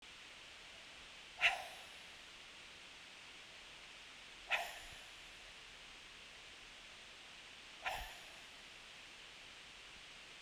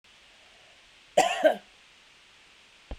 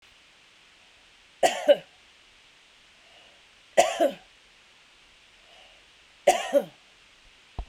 {"exhalation_length": "10.4 s", "exhalation_amplitude": 3388, "exhalation_signal_mean_std_ratio": 0.54, "cough_length": "3.0 s", "cough_amplitude": 12918, "cough_signal_mean_std_ratio": 0.29, "three_cough_length": "7.7 s", "three_cough_amplitude": 19901, "three_cough_signal_mean_std_ratio": 0.27, "survey_phase": "beta (2021-08-13 to 2022-03-07)", "age": "65+", "gender": "Female", "wearing_mask": "No", "symptom_none": true, "smoker_status": "Never smoked", "respiratory_condition_asthma": false, "respiratory_condition_other": false, "recruitment_source": "REACT", "submission_delay": "5 days", "covid_test_result": "Negative", "covid_test_method": "RT-qPCR"}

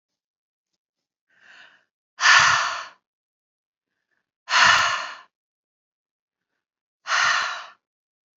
{"exhalation_length": "8.4 s", "exhalation_amplitude": 26668, "exhalation_signal_mean_std_ratio": 0.34, "survey_phase": "beta (2021-08-13 to 2022-03-07)", "age": "45-64", "gender": "Female", "wearing_mask": "No", "symptom_none": true, "symptom_onset": "12 days", "smoker_status": "Never smoked", "respiratory_condition_asthma": false, "respiratory_condition_other": false, "recruitment_source": "REACT", "submission_delay": "2 days", "covid_test_result": "Negative", "covid_test_method": "RT-qPCR", "influenza_a_test_result": "Negative", "influenza_b_test_result": "Negative"}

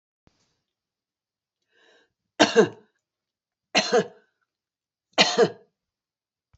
{"three_cough_length": "6.6 s", "three_cough_amplitude": 27376, "three_cough_signal_mean_std_ratio": 0.26, "survey_phase": "beta (2021-08-13 to 2022-03-07)", "age": "65+", "gender": "Female", "wearing_mask": "No", "symptom_runny_or_blocked_nose": true, "symptom_onset": "12 days", "smoker_status": "Ex-smoker", "respiratory_condition_asthma": false, "respiratory_condition_other": false, "recruitment_source": "REACT", "submission_delay": "2 days", "covid_test_result": "Negative", "covid_test_method": "RT-qPCR", "influenza_a_test_result": "Negative", "influenza_b_test_result": "Negative"}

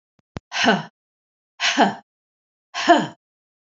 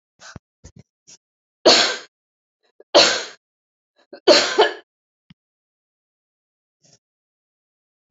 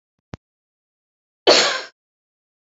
{"exhalation_length": "3.8 s", "exhalation_amplitude": 27501, "exhalation_signal_mean_std_ratio": 0.35, "three_cough_length": "8.1 s", "three_cough_amplitude": 30337, "three_cough_signal_mean_std_ratio": 0.26, "cough_length": "2.6 s", "cough_amplitude": 29575, "cough_signal_mean_std_ratio": 0.26, "survey_phase": "beta (2021-08-13 to 2022-03-07)", "age": "65+", "gender": "Female", "wearing_mask": "No", "symptom_shortness_of_breath": true, "symptom_fatigue": true, "symptom_headache": true, "smoker_status": "Prefer not to say", "respiratory_condition_asthma": false, "respiratory_condition_other": false, "recruitment_source": "Test and Trace", "submission_delay": "3 days", "covid_test_result": "Negative", "covid_test_method": "RT-qPCR"}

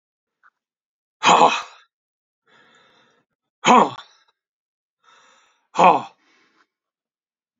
{"exhalation_length": "7.6 s", "exhalation_amplitude": 28068, "exhalation_signal_mean_std_ratio": 0.26, "survey_phase": "beta (2021-08-13 to 2022-03-07)", "age": "65+", "gender": "Male", "wearing_mask": "No", "symptom_none": true, "smoker_status": "Never smoked", "respiratory_condition_asthma": false, "respiratory_condition_other": false, "recruitment_source": "REACT", "submission_delay": "2 days", "covid_test_result": "Negative", "covid_test_method": "RT-qPCR", "influenza_a_test_result": "Negative", "influenza_b_test_result": "Negative"}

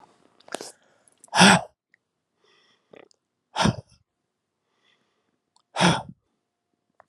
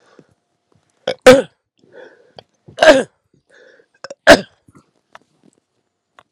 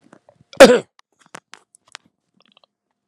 {"exhalation_length": "7.1 s", "exhalation_amplitude": 30215, "exhalation_signal_mean_std_ratio": 0.23, "three_cough_length": "6.3 s", "three_cough_amplitude": 32768, "three_cough_signal_mean_std_ratio": 0.23, "cough_length": "3.1 s", "cough_amplitude": 32768, "cough_signal_mean_std_ratio": 0.19, "survey_phase": "beta (2021-08-13 to 2022-03-07)", "age": "65+", "gender": "Male", "wearing_mask": "No", "symptom_cough_any": true, "smoker_status": "Ex-smoker", "respiratory_condition_asthma": false, "respiratory_condition_other": false, "recruitment_source": "REACT", "submission_delay": "2 days", "covid_test_result": "Negative", "covid_test_method": "RT-qPCR", "influenza_a_test_result": "Negative", "influenza_b_test_result": "Negative"}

